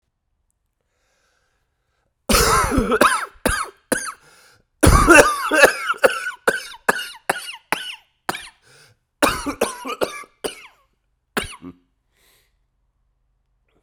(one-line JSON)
{"cough_length": "13.8 s", "cough_amplitude": 32768, "cough_signal_mean_std_ratio": 0.37, "survey_phase": "beta (2021-08-13 to 2022-03-07)", "age": "45-64", "gender": "Male", "wearing_mask": "Yes", "symptom_cough_any": true, "symptom_runny_or_blocked_nose": true, "symptom_sore_throat": true, "symptom_abdominal_pain": true, "symptom_fatigue": true, "symptom_headache": true, "symptom_change_to_sense_of_smell_or_taste": true, "symptom_onset": "3 days", "smoker_status": "Never smoked", "respiratory_condition_asthma": true, "respiratory_condition_other": false, "recruitment_source": "Test and Trace", "submission_delay": "1 day", "covid_test_result": "Positive", "covid_test_method": "RT-qPCR", "covid_ct_value": 13.6, "covid_ct_gene": "ORF1ab gene", "covid_ct_mean": 13.9, "covid_viral_load": "27000000 copies/ml", "covid_viral_load_category": "High viral load (>1M copies/ml)"}